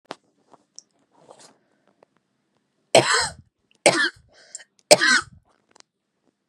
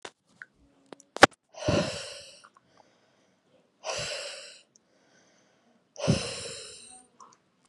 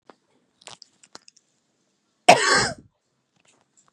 three_cough_length: 6.5 s
three_cough_amplitude: 32768
three_cough_signal_mean_std_ratio: 0.26
exhalation_length: 7.7 s
exhalation_amplitude: 32768
exhalation_signal_mean_std_ratio: 0.25
cough_length: 3.9 s
cough_amplitude: 32768
cough_signal_mean_std_ratio: 0.23
survey_phase: beta (2021-08-13 to 2022-03-07)
age: 18-44
gender: Female
wearing_mask: 'No'
symptom_none: true
smoker_status: Current smoker (e-cigarettes or vapes only)
respiratory_condition_asthma: false
respiratory_condition_other: false
recruitment_source: REACT
submission_delay: 2 days
covid_test_result: Negative
covid_test_method: RT-qPCR
influenza_a_test_result: Unknown/Void
influenza_b_test_result: Unknown/Void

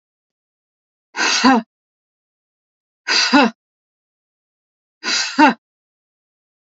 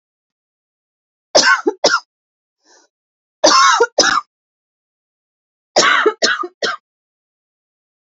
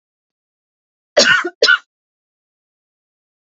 exhalation_length: 6.7 s
exhalation_amplitude: 30017
exhalation_signal_mean_std_ratio: 0.33
three_cough_length: 8.1 s
three_cough_amplitude: 32154
three_cough_signal_mean_std_ratio: 0.37
cough_length: 3.5 s
cough_amplitude: 32768
cough_signal_mean_std_ratio: 0.28
survey_phase: alpha (2021-03-01 to 2021-08-12)
age: 45-64
gender: Female
wearing_mask: 'No'
symptom_none: true
smoker_status: Ex-smoker
respiratory_condition_asthma: true
respiratory_condition_other: false
recruitment_source: REACT
submission_delay: 2 days
covid_test_result: Negative
covid_test_method: RT-qPCR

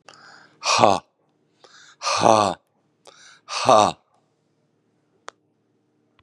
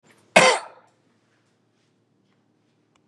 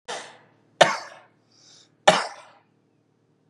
exhalation_length: 6.2 s
exhalation_amplitude: 32768
exhalation_signal_mean_std_ratio: 0.3
cough_length: 3.1 s
cough_amplitude: 32768
cough_signal_mean_std_ratio: 0.21
three_cough_length: 3.5 s
three_cough_amplitude: 32767
three_cough_signal_mean_std_ratio: 0.23
survey_phase: beta (2021-08-13 to 2022-03-07)
age: 45-64
gender: Male
wearing_mask: 'No'
symptom_cough_any: true
symptom_runny_or_blocked_nose: true
symptom_sore_throat: true
symptom_fatigue: true
symptom_headache: true
symptom_onset: 4 days
smoker_status: Ex-smoker
respiratory_condition_asthma: false
respiratory_condition_other: false
recruitment_source: Test and Trace
submission_delay: 0 days
covid_test_result: Positive
covid_test_method: ePCR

